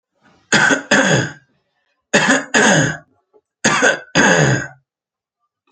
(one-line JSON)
{"three_cough_length": "5.7 s", "three_cough_amplitude": 32768, "three_cough_signal_mean_std_ratio": 0.54, "survey_phase": "beta (2021-08-13 to 2022-03-07)", "age": "18-44", "gender": "Male", "wearing_mask": "No", "symptom_none": true, "smoker_status": "Never smoked", "respiratory_condition_asthma": true, "respiratory_condition_other": false, "recruitment_source": "Test and Trace", "submission_delay": "0 days", "covid_test_result": "Negative", "covid_test_method": "LAMP"}